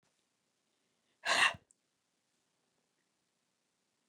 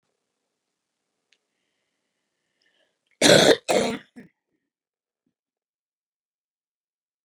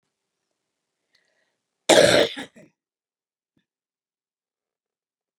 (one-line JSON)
{"exhalation_length": "4.1 s", "exhalation_amplitude": 5673, "exhalation_signal_mean_std_ratio": 0.2, "three_cough_length": "7.2 s", "three_cough_amplitude": 28869, "three_cough_signal_mean_std_ratio": 0.21, "cough_length": "5.4 s", "cough_amplitude": 29780, "cough_signal_mean_std_ratio": 0.21, "survey_phase": "beta (2021-08-13 to 2022-03-07)", "age": "65+", "gender": "Female", "wearing_mask": "No", "symptom_cough_any": true, "smoker_status": "Ex-smoker", "respiratory_condition_asthma": false, "respiratory_condition_other": false, "recruitment_source": "REACT", "submission_delay": "1 day", "covid_test_result": "Negative", "covid_test_method": "RT-qPCR", "influenza_a_test_result": "Negative", "influenza_b_test_result": "Negative"}